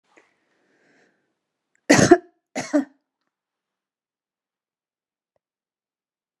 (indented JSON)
{
  "cough_length": "6.4 s",
  "cough_amplitude": 32767,
  "cough_signal_mean_std_ratio": 0.18,
  "survey_phase": "beta (2021-08-13 to 2022-03-07)",
  "age": "65+",
  "gender": "Female",
  "wearing_mask": "No",
  "symptom_none": true,
  "smoker_status": "Never smoked",
  "respiratory_condition_asthma": false,
  "respiratory_condition_other": false,
  "recruitment_source": "REACT",
  "submission_delay": "3 days",
  "covid_test_result": "Negative",
  "covid_test_method": "RT-qPCR"
}